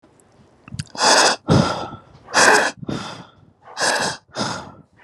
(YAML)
exhalation_length: 5.0 s
exhalation_amplitude: 31178
exhalation_signal_mean_std_ratio: 0.5
survey_phase: alpha (2021-03-01 to 2021-08-12)
age: 18-44
gender: Male
wearing_mask: 'Yes'
symptom_none: true
smoker_status: Ex-smoker
respiratory_condition_asthma: false
respiratory_condition_other: false
recruitment_source: REACT
submission_delay: 1 day
covid_test_result: Negative
covid_test_method: RT-qPCR